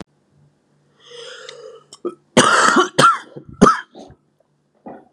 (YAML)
cough_length: 5.1 s
cough_amplitude: 32768
cough_signal_mean_std_ratio: 0.37
survey_phase: beta (2021-08-13 to 2022-03-07)
age: 18-44
gender: Male
wearing_mask: 'No'
symptom_cough_any: true
symptom_new_continuous_cough: true
symptom_runny_or_blocked_nose: true
symptom_shortness_of_breath: true
symptom_fatigue: true
symptom_headache: true
symptom_change_to_sense_of_smell_or_taste: true
symptom_onset: 5 days
smoker_status: Current smoker (11 or more cigarettes per day)
respiratory_condition_asthma: true
respiratory_condition_other: false
recruitment_source: Test and Trace
submission_delay: 1 day
covid_test_result: Negative
covid_test_method: RT-qPCR